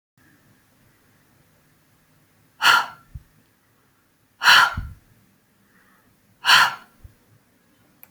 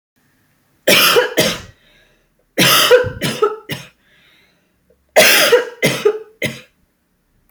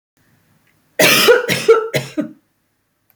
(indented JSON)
{
  "exhalation_length": "8.1 s",
  "exhalation_amplitude": 27466,
  "exhalation_signal_mean_std_ratio": 0.26,
  "three_cough_length": "7.5 s",
  "three_cough_amplitude": 32768,
  "three_cough_signal_mean_std_ratio": 0.46,
  "cough_length": "3.2 s",
  "cough_amplitude": 32767,
  "cough_signal_mean_std_ratio": 0.44,
  "survey_phase": "beta (2021-08-13 to 2022-03-07)",
  "age": "45-64",
  "gender": "Female",
  "wearing_mask": "No",
  "symptom_none": true,
  "symptom_onset": "4 days",
  "smoker_status": "Ex-smoker",
  "respiratory_condition_asthma": false,
  "respiratory_condition_other": false,
  "recruitment_source": "REACT",
  "submission_delay": "0 days",
  "covid_test_result": "Negative",
  "covid_test_method": "RT-qPCR"
}